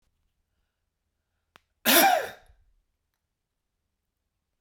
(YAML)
cough_length: 4.6 s
cough_amplitude: 22256
cough_signal_mean_std_ratio: 0.23
survey_phase: beta (2021-08-13 to 2022-03-07)
age: 18-44
gender: Male
wearing_mask: 'No'
symptom_none: true
smoker_status: Ex-smoker
respiratory_condition_asthma: false
respiratory_condition_other: false
recruitment_source: REACT
submission_delay: 1 day
covid_test_result: Negative
covid_test_method: RT-qPCR